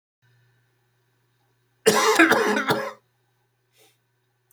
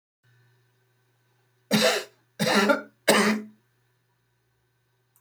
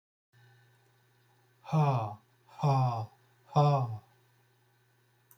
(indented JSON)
{
  "cough_length": "4.5 s",
  "cough_amplitude": 25377,
  "cough_signal_mean_std_ratio": 0.36,
  "three_cough_length": "5.2 s",
  "three_cough_amplitude": 20144,
  "three_cough_signal_mean_std_ratio": 0.37,
  "exhalation_length": "5.4 s",
  "exhalation_amplitude": 6346,
  "exhalation_signal_mean_std_ratio": 0.41,
  "survey_phase": "beta (2021-08-13 to 2022-03-07)",
  "age": "45-64",
  "gender": "Male",
  "wearing_mask": "No",
  "symptom_none": true,
  "smoker_status": "Current smoker (1 to 10 cigarettes per day)",
  "respiratory_condition_asthma": false,
  "respiratory_condition_other": false,
  "recruitment_source": "REACT",
  "submission_delay": "2 days",
  "covid_test_result": "Negative",
  "covid_test_method": "RT-qPCR"
}